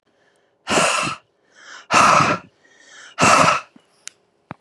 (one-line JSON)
{"exhalation_length": "4.6 s", "exhalation_amplitude": 31013, "exhalation_signal_mean_std_ratio": 0.45, "survey_phase": "beta (2021-08-13 to 2022-03-07)", "age": "45-64", "gender": "Female", "wearing_mask": "No", "symptom_none": true, "smoker_status": "Never smoked", "respiratory_condition_asthma": false, "respiratory_condition_other": false, "recruitment_source": "REACT", "submission_delay": "3 days", "covid_test_result": "Negative", "covid_test_method": "RT-qPCR", "influenza_a_test_result": "Negative", "influenza_b_test_result": "Negative"}